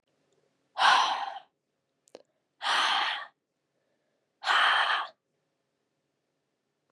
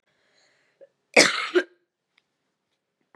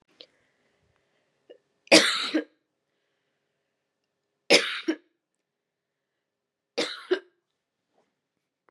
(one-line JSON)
{"exhalation_length": "6.9 s", "exhalation_amplitude": 12564, "exhalation_signal_mean_std_ratio": 0.4, "cough_length": "3.2 s", "cough_amplitude": 29427, "cough_signal_mean_std_ratio": 0.24, "three_cough_length": "8.7 s", "three_cough_amplitude": 26025, "three_cough_signal_mean_std_ratio": 0.22, "survey_phase": "beta (2021-08-13 to 2022-03-07)", "age": "18-44", "gender": "Female", "wearing_mask": "No", "symptom_cough_any": true, "symptom_runny_or_blocked_nose": true, "symptom_fatigue": true, "symptom_headache": true, "symptom_change_to_sense_of_smell_or_taste": true, "smoker_status": "Never smoked", "respiratory_condition_asthma": false, "respiratory_condition_other": false, "recruitment_source": "Test and Trace", "submission_delay": "1 day", "covid_test_result": "Positive", "covid_test_method": "ePCR"}